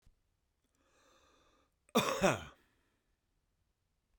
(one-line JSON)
{"cough_length": "4.2 s", "cough_amplitude": 5632, "cough_signal_mean_std_ratio": 0.24, "survey_phase": "beta (2021-08-13 to 2022-03-07)", "age": "65+", "gender": "Male", "wearing_mask": "No", "symptom_runny_or_blocked_nose": true, "symptom_sore_throat": true, "smoker_status": "Ex-smoker", "respiratory_condition_asthma": false, "respiratory_condition_other": true, "recruitment_source": "REACT", "submission_delay": "2 days", "covid_test_result": "Negative", "covid_test_method": "RT-qPCR", "influenza_a_test_result": "Negative", "influenza_b_test_result": "Negative"}